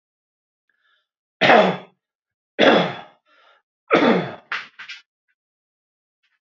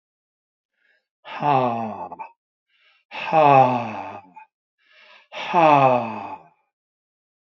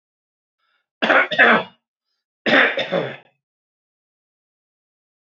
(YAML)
three_cough_length: 6.5 s
three_cough_amplitude: 27878
three_cough_signal_mean_std_ratio: 0.32
exhalation_length: 7.4 s
exhalation_amplitude: 25453
exhalation_signal_mean_std_ratio: 0.41
cough_length: 5.2 s
cough_amplitude: 32768
cough_signal_mean_std_ratio: 0.34
survey_phase: alpha (2021-03-01 to 2021-08-12)
age: 45-64
gender: Male
wearing_mask: 'No'
symptom_none: true
smoker_status: Never smoked
respiratory_condition_asthma: false
respiratory_condition_other: false
recruitment_source: REACT
submission_delay: 1 day
covid_test_result: Negative
covid_test_method: RT-qPCR